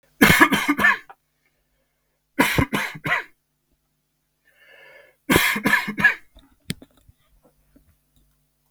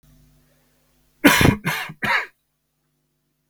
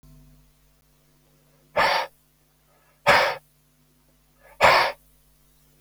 {"three_cough_length": "8.7 s", "three_cough_amplitude": 32768, "three_cough_signal_mean_std_ratio": 0.36, "cough_length": "3.5 s", "cough_amplitude": 32768, "cough_signal_mean_std_ratio": 0.33, "exhalation_length": "5.8 s", "exhalation_amplitude": 25202, "exhalation_signal_mean_std_ratio": 0.31, "survey_phase": "beta (2021-08-13 to 2022-03-07)", "age": "18-44", "gender": "Male", "wearing_mask": "No", "symptom_none": true, "symptom_onset": "12 days", "smoker_status": "Ex-smoker", "respiratory_condition_asthma": false, "respiratory_condition_other": false, "recruitment_source": "REACT", "submission_delay": "2 days", "covid_test_result": "Positive", "covid_test_method": "RT-qPCR", "covid_ct_value": 35.0, "covid_ct_gene": "N gene", "influenza_a_test_result": "Negative", "influenza_b_test_result": "Negative"}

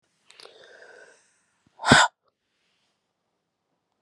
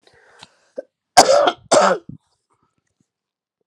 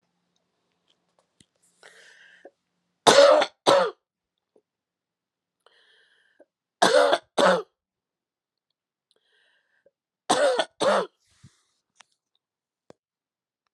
{"exhalation_length": "4.0 s", "exhalation_amplitude": 32720, "exhalation_signal_mean_std_ratio": 0.19, "cough_length": "3.7 s", "cough_amplitude": 32768, "cough_signal_mean_std_ratio": 0.32, "three_cough_length": "13.7 s", "three_cough_amplitude": 32254, "three_cough_signal_mean_std_ratio": 0.28, "survey_phase": "alpha (2021-03-01 to 2021-08-12)", "age": "65+", "gender": "Female", "wearing_mask": "No", "symptom_none": true, "smoker_status": "Ex-smoker", "respiratory_condition_asthma": false, "respiratory_condition_other": false, "recruitment_source": "REACT", "submission_delay": "3 days", "covid_test_method": "RT-qPCR"}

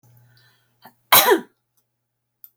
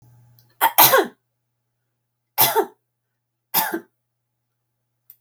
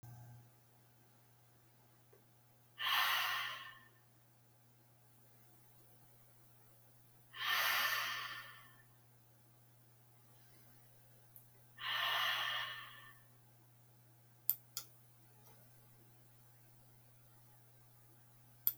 {"cough_length": "2.6 s", "cough_amplitude": 32768, "cough_signal_mean_std_ratio": 0.26, "three_cough_length": "5.2 s", "three_cough_amplitude": 32768, "three_cough_signal_mean_std_ratio": 0.3, "exhalation_length": "18.8 s", "exhalation_amplitude": 7999, "exhalation_signal_mean_std_ratio": 0.41, "survey_phase": "beta (2021-08-13 to 2022-03-07)", "age": "45-64", "gender": "Female", "wearing_mask": "No", "symptom_none": true, "smoker_status": "Never smoked", "respiratory_condition_asthma": false, "respiratory_condition_other": false, "recruitment_source": "REACT", "submission_delay": "1 day", "covid_test_result": "Negative", "covid_test_method": "RT-qPCR"}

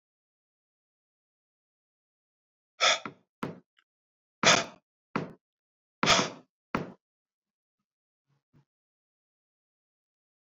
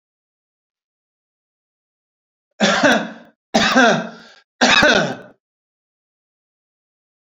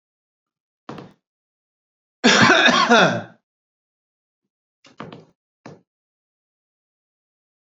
{"exhalation_length": "10.4 s", "exhalation_amplitude": 14489, "exhalation_signal_mean_std_ratio": 0.21, "three_cough_length": "7.3 s", "three_cough_amplitude": 30580, "three_cough_signal_mean_std_ratio": 0.36, "cough_length": "7.8 s", "cough_amplitude": 29887, "cough_signal_mean_std_ratio": 0.29, "survey_phase": "alpha (2021-03-01 to 2021-08-12)", "age": "45-64", "gender": "Male", "wearing_mask": "No", "symptom_none": true, "smoker_status": "Ex-smoker", "respiratory_condition_asthma": false, "respiratory_condition_other": false, "recruitment_source": "REACT", "submission_delay": "3 days", "covid_test_result": "Negative", "covid_test_method": "RT-qPCR"}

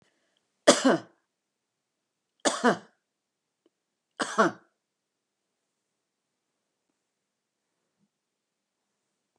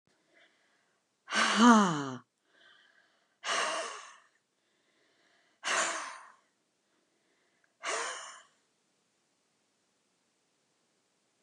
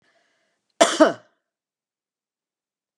{"three_cough_length": "9.4 s", "three_cough_amplitude": 22174, "three_cough_signal_mean_std_ratio": 0.2, "exhalation_length": "11.4 s", "exhalation_amplitude": 15543, "exhalation_signal_mean_std_ratio": 0.28, "cough_length": "3.0 s", "cough_amplitude": 31278, "cough_signal_mean_std_ratio": 0.21, "survey_phase": "beta (2021-08-13 to 2022-03-07)", "age": "65+", "gender": "Female", "wearing_mask": "No", "symptom_none": true, "smoker_status": "Never smoked", "respiratory_condition_asthma": false, "respiratory_condition_other": false, "recruitment_source": "REACT", "submission_delay": "1 day", "covid_test_result": "Negative", "covid_test_method": "RT-qPCR", "influenza_a_test_result": "Negative", "influenza_b_test_result": "Negative"}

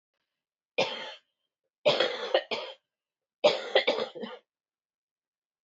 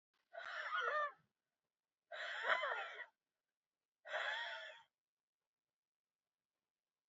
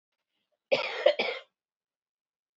{"three_cough_length": "5.6 s", "three_cough_amplitude": 11840, "three_cough_signal_mean_std_ratio": 0.36, "exhalation_length": "7.1 s", "exhalation_amplitude": 2450, "exhalation_signal_mean_std_ratio": 0.44, "cough_length": "2.6 s", "cough_amplitude": 13367, "cough_signal_mean_std_ratio": 0.31, "survey_phase": "alpha (2021-03-01 to 2021-08-12)", "age": "45-64", "gender": "Female", "wearing_mask": "No", "symptom_cough_any": true, "symptom_fatigue": true, "symptom_headache": true, "smoker_status": "Ex-smoker", "respiratory_condition_asthma": false, "respiratory_condition_other": false, "recruitment_source": "Test and Trace", "submission_delay": "2 days", "covid_test_result": "Positive", "covid_test_method": "RT-qPCR", "covid_ct_value": 15.6, "covid_ct_gene": "ORF1ab gene", "covid_ct_mean": 16.1, "covid_viral_load": "5200000 copies/ml", "covid_viral_load_category": "High viral load (>1M copies/ml)"}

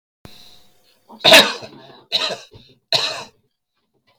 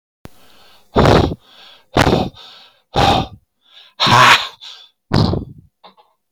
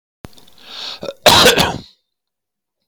{"three_cough_length": "4.2 s", "three_cough_amplitude": 32768, "three_cough_signal_mean_std_ratio": 0.3, "exhalation_length": "6.3 s", "exhalation_amplitude": 32767, "exhalation_signal_mean_std_ratio": 0.43, "cough_length": "2.9 s", "cough_amplitude": 32767, "cough_signal_mean_std_ratio": 0.38, "survey_phase": "beta (2021-08-13 to 2022-03-07)", "age": "65+", "gender": "Male", "wearing_mask": "No", "symptom_none": true, "smoker_status": "Never smoked", "respiratory_condition_asthma": false, "respiratory_condition_other": false, "recruitment_source": "REACT", "submission_delay": "4 days", "covid_test_result": "Negative", "covid_test_method": "RT-qPCR", "influenza_a_test_result": "Negative", "influenza_b_test_result": "Negative"}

